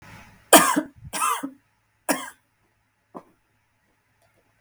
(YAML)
three_cough_length: 4.6 s
three_cough_amplitude: 32768
three_cough_signal_mean_std_ratio: 0.26
survey_phase: beta (2021-08-13 to 2022-03-07)
age: 18-44
gender: Female
wearing_mask: 'No'
symptom_none: true
smoker_status: Ex-smoker
respiratory_condition_asthma: false
respiratory_condition_other: false
recruitment_source: Test and Trace
submission_delay: 3 days
covid_test_result: Negative
covid_test_method: RT-qPCR